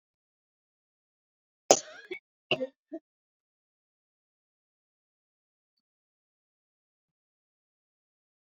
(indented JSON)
{
  "exhalation_length": "8.4 s",
  "exhalation_amplitude": 23866,
  "exhalation_signal_mean_std_ratio": 0.11,
  "survey_phase": "beta (2021-08-13 to 2022-03-07)",
  "age": "65+",
  "gender": "Female",
  "wearing_mask": "No",
  "symptom_cough_any": true,
  "symptom_fatigue": true,
  "smoker_status": "Never smoked",
  "respiratory_condition_asthma": true,
  "respiratory_condition_other": false,
  "recruitment_source": "REACT",
  "submission_delay": "2 days",
  "covid_test_result": "Negative",
  "covid_test_method": "RT-qPCR"
}